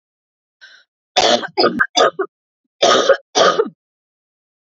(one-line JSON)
{"cough_length": "4.6 s", "cough_amplitude": 32768, "cough_signal_mean_std_ratio": 0.44, "survey_phase": "beta (2021-08-13 to 2022-03-07)", "age": "45-64", "gender": "Female", "wearing_mask": "No", "symptom_cough_any": true, "symptom_runny_or_blocked_nose": true, "symptom_sore_throat": true, "symptom_headache": true, "symptom_other": true, "symptom_onset": "2 days", "smoker_status": "Never smoked", "respiratory_condition_asthma": false, "respiratory_condition_other": false, "recruitment_source": "Test and Trace", "submission_delay": "1 day", "covid_test_result": "Positive", "covid_test_method": "RT-qPCR", "covid_ct_value": 28.3, "covid_ct_gene": "ORF1ab gene", "covid_ct_mean": 29.2, "covid_viral_load": "260 copies/ml", "covid_viral_load_category": "Minimal viral load (< 10K copies/ml)"}